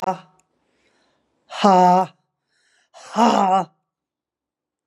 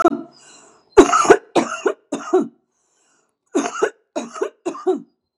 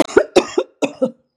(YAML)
exhalation_length: 4.9 s
exhalation_amplitude: 30868
exhalation_signal_mean_std_ratio: 0.36
three_cough_length: 5.4 s
three_cough_amplitude: 32768
three_cough_signal_mean_std_ratio: 0.39
cough_length: 1.4 s
cough_amplitude: 32768
cough_signal_mean_std_ratio: 0.41
survey_phase: beta (2021-08-13 to 2022-03-07)
age: 45-64
gender: Female
wearing_mask: 'No'
symptom_cough_any: true
symptom_runny_or_blocked_nose: true
symptom_sore_throat: true
symptom_fatigue: true
symptom_headache: true
smoker_status: Prefer not to say
respiratory_condition_asthma: false
respiratory_condition_other: false
recruitment_source: Test and Trace
submission_delay: 2 days
covid_test_result: Positive
covid_test_method: LFT